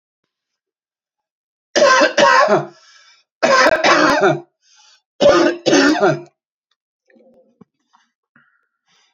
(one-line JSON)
{"three_cough_length": "9.1 s", "three_cough_amplitude": 30340, "three_cough_signal_mean_std_ratio": 0.46, "survey_phase": "beta (2021-08-13 to 2022-03-07)", "age": "65+", "gender": "Male", "wearing_mask": "No", "symptom_cough_any": true, "smoker_status": "Never smoked", "respiratory_condition_asthma": false, "respiratory_condition_other": false, "recruitment_source": "REACT", "submission_delay": "2 days", "covid_test_result": "Negative", "covid_test_method": "RT-qPCR", "influenza_a_test_result": "Negative", "influenza_b_test_result": "Negative"}